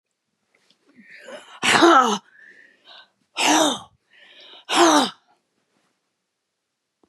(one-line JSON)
{"exhalation_length": "7.1 s", "exhalation_amplitude": 32013, "exhalation_signal_mean_std_ratio": 0.35, "survey_phase": "beta (2021-08-13 to 2022-03-07)", "age": "65+", "gender": "Female", "wearing_mask": "No", "symptom_cough_any": true, "symptom_runny_or_blocked_nose": true, "symptom_fatigue": true, "smoker_status": "Never smoked", "respiratory_condition_asthma": false, "respiratory_condition_other": true, "recruitment_source": "Test and Trace", "submission_delay": "1 day", "covid_test_result": "Negative", "covid_test_method": "RT-qPCR"}